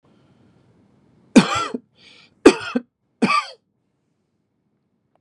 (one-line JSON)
{"three_cough_length": "5.2 s", "three_cough_amplitude": 32768, "three_cough_signal_mean_std_ratio": 0.24, "survey_phase": "beta (2021-08-13 to 2022-03-07)", "age": "45-64", "gender": "Male", "wearing_mask": "No", "symptom_none": true, "smoker_status": "Never smoked", "respiratory_condition_asthma": false, "respiratory_condition_other": false, "recruitment_source": "REACT", "submission_delay": "1 day", "covid_test_result": "Negative", "covid_test_method": "RT-qPCR", "influenza_a_test_result": "Negative", "influenza_b_test_result": "Negative"}